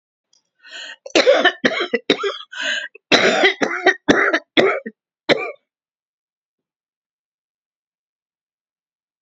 {"cough_length": "9.2 s", "cough_amplitude": 30077, "cough_signal_mean_std_ratio": 0.4, "survey_phase": "beta (2021-08-13 to 2022-03-07)", "age": "65+", "gender": "Female", "wearing_mask": "No", "symptom_cough_any": true, "smoker_status": "Never smoked", "respiratory_condition_asthma": false, "respiratory_condition_other": false, "recruitment_source": "REACT", "submission_delay": "2 days", "covid_test_result": "Negative", "covid_test_method": "RT-qPCR", "influenza_a_test_result": "Negative", "influenza_b_test_result": "Negative"}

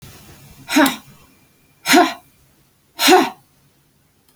{"exhalation_length": "4.4 s", "exhalation_amplitude": 32767, "exhalation_signal_mean_std_ratio": 0.35, "survey_phase": "beta (2021-08-13 to 2022-03-07)", "age": "65+", "gender": "Female", "wearing_mask": "No", "symptom_none": true, "smoker_status": "Never smoked", "respiratory_condition_asthma": false, "respiratory_condition_other": false, "recruitment_source": "REACT", "submission_delay": "6 days", "covid_test_result": "Negative", "covid_test_method": "RT-qPCR"}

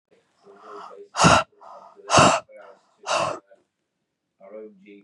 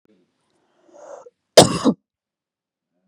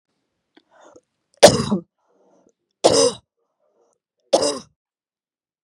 {"exhalation_length": "5.0 s", "exhalation_amplitude": 29572, "exhalation_signal_mean_std_ratio": 0.34, "cough_length": "3.1 s", "cough_amplitude": 32768, "cough_signal_mean_std_ratio": 0.21, "three_cough_length": "5.6 s", "three_cough_amplitude": 32768, "three_cough_signal_mean_std_ratio": 0.26, "survey_phase": "beta (2021-08-13 to 2022-03-07)", "age": "18-44", "gender": "Female", "wearing_mask": "No", "symptom_cough_any": true, "symptom_runny_or_blocked_nose": true, "symptom_shortness_of_breath": true, "symptom_sore_throat": true, "symptom_abdominal_pain": true, "symptom_fatigue": true, "symptom_fever_high_temperature": true, "symptom_headache": true, "symptom_change_to_sense_of_smell_or_taste": true, "symptom_loss_of_taste": true, "symptom_onset": "14 days", "smoker_status": "Never smoked", "respiratory_condition_asthma": false, "respiratory_condition_other": false, "recruitment_source": "Test and Trace", "submission_delay": "3 days", "covid_test_result": "Positive", "covid_test_method": "RT-qPCR", "covid_ct_value": 26.2, "covid_ct_gene": "ORF1ab gene"}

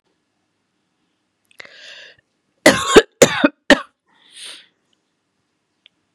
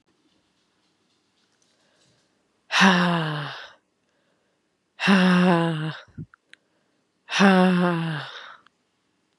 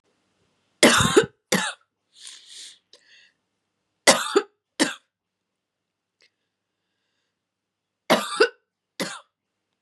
{"cough_length": "6.1 s", "cough_amplitude": 32768, "cough_signal_mean_std_ratio": 0.22, "exhalation_length": "9.4 s", "exhalation_amplitude": 25932, "exhalation_signal_mean_std_ratio": 0.41, "three_cough_length": "9.8 s", "three_cough_amplitude": 32767, "three_cough_signal_mean_std_ratio": 0.27, "survey_phase": "beta (2021-08-13 to 2022-03-07)", "age": "18-44", "gender": "Female", "wearing_mask": "No", "symptom_cough_any": true, "symptom_shortness_of_breath": true, "symptom_fatigue": true, "symptom_headache": true, "symptom_other": true, "symptom_onset": "4 days", "smoker_status": "Never smoked", "respiratory_condition_asthma": false, "respiratory_condition_other": false, "recruitment_source": "Test and Trace", "submission_delay": "1 day", "covid_test_result": "Positive", "covid_test_method": "RT-qPCR", "covid_ct_value": 20.7, "covid_ct_gene": "ORF1ab gene", "covid_ct_mean": 21.2, "covid_viral_load": "110000 copies/ml", "covid_viral_load_category": "Low viral load (10K-1M copies/ml)"}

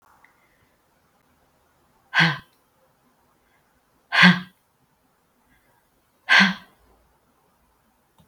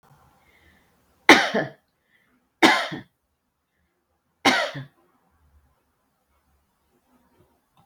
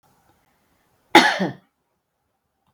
{"exhalation_length": "8.3 s", "exhalation_amplitude": 31626, "exhalation_signal_mean_std_ratio": 0.23, "three_cough_length": "7.9 s", "three_cough_amplitude": 32768, "three_cough_signal_mean_std_ratio": 0.23, "cough_length": "2.7 s", "cough_amplitude": 32768, "cough_signal_mean_std_ratio": 0.23, "survey_phase": "beta (2021-08-13 to 2022-03-07)", "age": "45-64", "gender": "Female", "wearing_mask": "No", "symptom_none": true, "smoker_status": "Ex-smoker", "respiratory_condition_asthma": false, "respiratory_condition_other": false, "recruitment_source": "REACT", "submission_delay": "2 days", "covid_test_result": "Negative", "covid_test_method": "RT-qPCR"}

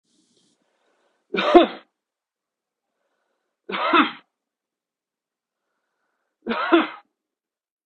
{"three_cough_length": "7.9 s", "three_cough_amplitude": 32768, "three_cough_signal_mean_std_ratio": 0.25, "survey_phase": "beta (2021-08-13 to 2022-03-07)", "age": "18-44", "gender": "Male", "wearing_mask": "No", "symptom_cough_any": true, "symptom_runny_or_blocked_nose": true, "smoker_status": "Prefer not to say", "respiratory_condition_asthma": false, "respiratory_condition_other": false, "recruitment_source": "Test and Trace", "submission_delay": "2 days", "covid_test_result": "Positive", "covid_test_method": "RT-qPCR", "covid_ct_value": 17.7, "covid_ct_gene": "ORF1ab gene", "covid_ct_mean": 18.7, "covid_viral_load": "750000 copies/ml", "covid_viral_load_category": "Low viral load (10K-1M copies/ml)"}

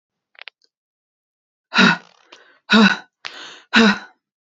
{"exhalation_length": "4.4 s", "exhalation_amplitude": 29655, "exhalation_signal_mean_std_ratio": 0.33, "survey_phase": "beta (2021-08-13 to 2022-03-07)", "age": "18-44", "gender": "Female", "wearing_mask": "No", "symptom_cough_any": true, "symptom_diarrhoea": true, "symptom_fatigue": true, "symptom_headache": true, "symptom_change_to_sense_of_smell_or_taste": true, "symptom_onset": "1 day", "smoker_status": "Never smoked", "respiratory_condition_asthma": false, "respiratory_condition_other": false, "recruitment_source": "Test and Trace", "submission_delay": "0 days", "covid_test_result": "Negative", "covid_test_method": "RT-qPCR"}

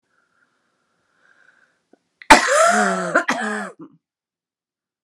{"cough_length": "5.0 s", "cough_amplitude": 32768, "cough_signal_mean_std_ratio": 0.35, "survey_phase": "beta (2021-08-13 to 2022-03-07)", "age": "65+", "gender": "Female", "wearing_mask": "No", "symptom_none": true, "smoker_status": "Current smoker (1 to 10 cigarettes per day)", "respiratory_condition_asthma": false, "respiratory_condition_other": false, "recruitment_source": "REACT", "submission_delay": "0 days", "covid_test_result": "Negative", "covid_test_method": "RT-qPCR"}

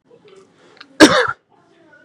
{"cough_length": "2.0 s", "cough_amplitude": 32768, "cough_signal_mean_std_ratio": 0.28, "survey_phase": "beta (2021-08-13 to 2022-03-07)", "age": "18-44", "gender": "Male", "wearing_mask": "Yes", "symptom_none": true, "smoker_status": "Never smoked", "respiratory_condition_asthma": false, "respiratory_condition_other": false, "recruitment_source": "REACT", "submission_delay": "2 days", "covid_test_result": "Negative", "covid_test_method": "RT-qPCR", "influenza_a_test_result": "Negative", "influenza_b_test_result": "Negative"}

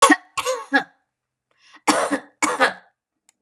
{"cough_length": "3.4 s", "cough_amplitude": 31874, "cough_signal_mean_std_ratio": 0.4, "survey_phase": "beta (2021-08-13 to 2022-03-07)", "age": "45-64", "gender": "Female", "wearing_mask": "No", "symptom_runny_or_blocked_nose": true, "symptom_headache": true, "smoker_status": "Never smoked", "respiratory_condition_asthma": false, "respiratory_condition_other": false, "recruitment_source": "REACT", "submission_delay": "1 day", "covid_test_result": "Negative", "covid_test_method": "RT-qPCR", "influenza_a_test_result": "Negative", "influenza_b_test_result": "Negative"}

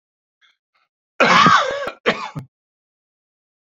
{"cough_length": "3.7 s", "cough_amplitude": 27498, "cough_signal_mean_std_ratio": 0.36, "survey_phase": "beta (2021-08-13 to 2022-03-07)", "age": "45-64", "gender": "Male", "wearing_mask": "No", "symptom_cough_any": true, "symptom_runny_or_blocked_nose": true, "symptom_fatigue": true, "symptom_onset": "2 days", "smoker_status": "Never smoked", "respiratory_condition_asthma": false, "respiratory_condition_other": false, "recruitment_source": "Test and Trace", "submission_delay": "2 days", "covid_test_result": "Positive", "covid_test_method": "RT-qPCR", "covid_ct_value": 19.9, "covid_ct_gene": "N gene", "covid_ct_mean": 21.3, "covid_viral_load": "100000 copies/ml", "covid_viral_load_category": "Low viral load (10K-1M copies/ml)"}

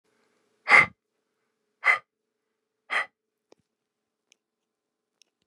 {"exhalation_length": "5.5 s", "exhalation_amplitude": 24853, "exhalation_signal_mean_std_ratio": 0.2, "survey_phase": "beta (2021-08-13 to 2022-03-07)", "age": "45-64", "gender": "Male", "wearing_mask": "No", "symptom_none": true, "smoker_status": "Never smoked", "respiratory_condition_asthma": false, "respiratory_condition_other": false, "recruitment_source": "REACT", "submission_delay": "1 day", "covid_test_result": "Negative", "covid_test_method": "RT-qPCR", "influenza_a_test_result": "Negative", "influenza_b_test_result": "Negative"}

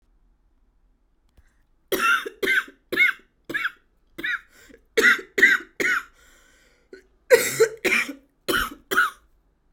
{"cough_length": "9.7 s", "cough_amplitude": 27182, "cough_signal_mean_std_ratio": 0.41, "survey_phase": "alpha (2021-03-01 to 2021-08-12)", "age": "18-44", "gender": "Female", "wearing_mask": "No", "symptom_cough_any": true, "symptom_headache": true, "smoker_status": "Ex-smoker", "respiratory_condition_asthma": false, "respiratory_condition_other": false, "recruitment_source": "Test and Trace", "submission_delay": "2 days", "covid_test_result": "Positive", "covid_test_method": "RT-qPCR", "covid_ct_value": 23.1, "covid_ct_gene": "ORF1ab gene", "covid_ct_mean": 23.8, "covid_viral_load": "15000 copies/ml", "covid_viral_load_category": "Low viral load (10K-1M copies/ml)"}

